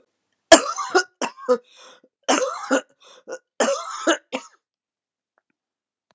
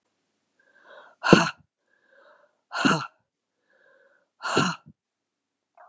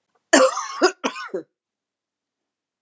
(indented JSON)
{
  "three_cough_length": "6.1 s",
  "three_cough_amplitude": 32768,
  "three_cough_signal_mean_std_ratio": 0.32,
  "exhalation_length": "5.9 s",
  "exhalation_amplitude": 32768,
  "exhalation_signal_mean_std_ratio": 0.25,
  "cough_length": "2.8 s",
  "cough_amplitude": 27955,
  "cough_signal_mean_std_ratio": 0.33,
  "survey_phase": "beta (2021-08-13 to 2022-03-07)",
  "age": "65+",
  "gender": "Female",
  "wearing_mask": "No",
  "symptom_cough_any": true,
  "symptom_runny_or_blocked_nose": true,
  "symptom_change_to_sense_of_smell_or_taste": true,
  "smoker_status": "Ex-smoker",
  "respiratory_condition_asthma": false,
  "respiratory_condition_other": false,
  "recruitment_source": "Test and Trace",
  "submission_delay": "2 days",
  "covid_test_result": "Positive",
  "covid_test_method": "LFT"
}